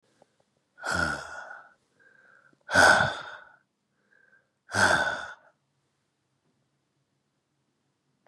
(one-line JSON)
{"exhalation_length": "8.3 s", "exhalation_amplitude": 16665, "exhalation_signal_mean_std_ratio": 0.3, "survey_phase": "beta (2021-08-13 to 2022-03-07)", "age": "45-64", "gender": "Male", "wearing_mask": "No", "symptom_cough_any": true, "symptom_runny_or_blocked_nose": true, "symptom_shortness_of_breath": true, "symptom_headache": true, "symptom_loss_of_taste": true, "smoker_status": "Never smoked", "respiratory_condition_asthma": false, "respiratory_condition_other": false, "recruitment_source": "Test and Trace", "submission_delay": "1 day", "covid_test_result": "Positive", "covid_test_method": "LFT"}